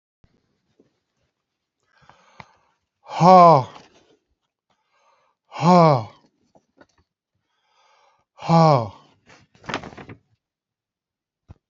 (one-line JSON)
{"exhalation_length": "11.7 s", "exhalation_amplitude": 31022, "exhalation_signal_mean_std_ratio": 0.25, "survey_phase": "beta (2021-08-13 to 2022-03-07)", "age": "65+", "gender": "Male", "wearing_mask": "No", "symptom_none": true, "smoker_status": "Ex-smoker", "respiratory_condition_asthma": false, "respiratory_condition_other": false, "recruitment_source": "REACT", "submission_delay": "2 days", "covid_test_result": "Negative", "covid_test_method": "RT-qPCR"}